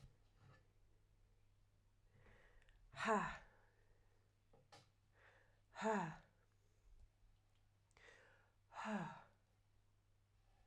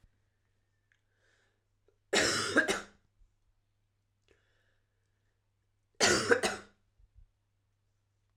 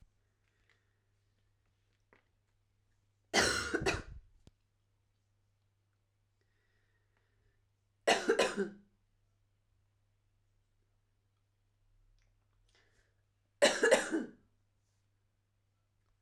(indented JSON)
{
  "exhalation_length": "10.7 s",
  "exhalation_amplitude": 1592,
  "exhalation_signal_mean_std_ratio": 0.32,
  "cough_length": "8.4 s",
  "cough_amplitude": 9546,
  "cough_signal_mean_std_ratio": 0.28,
  "three_cough_length": "16.2 s",
  "three_cough_amplitude": 8083,
  "three_cough_signal_mean_std_ratio": 0.25,
  "survey_phase": "alpha (2021-03-01 to 2021-08-12)",
  "age": "45-64",
  "gender": "Female",
  "wearing_mask": "No",
  "symptom_fatigue": true,
  "symptom_fever_high_temperature": true,
  "symptom_headache": true,
  "symptom_change_to_sense_of_smell_or_taste": true,
  "symptom_onset": "9 days",
  "smoker_status": "Ex-smoker",
  "respiratory_condition_asthma": false,
  "respiratory_condition_other": false,
  "recruitment_source": "Test and Trace",
  "submission_delay": "1 day",
  "covid_test_result": "Positive",
  "covid_test_method": "RT-qPCR",
  "covid_ct_value": 11.7,
  "covid_ct_gene": "ORF1ab gene",
  "covid_ct_mean": 12.0,
  "covid_viral_load": "120000000 copies/ml",
  "covid_viral_load_category": "High viral load (>1M copies/ml)"
}